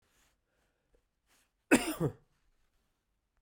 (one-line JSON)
{"cough_length": "3.4 s", "cough_amplitude": 9073, "cough_signal_mean_std_ratio": 0.21, "survey_phase": "beta (2021-08-13 to 2022-03-07)", "age": "45-64", "gender": "Male", "wearing_mask": "No", "symptom_cough_any": true, "symptom_runny_or_blocked_nose": true, "symptom_onset": "4 days", "smoker_status": "Never smoked", "respiratory_condition_asthma": false, "respiratory_condition_other": false, "recruitment_source": "Test and Trace", "submission_delay": "2 days", "covid_test_result": "Positive", "covid_test_method": "RT-qPCR", "covid_ct_value": 12.4, "covid_ct_gene": "ORF1ab gene"}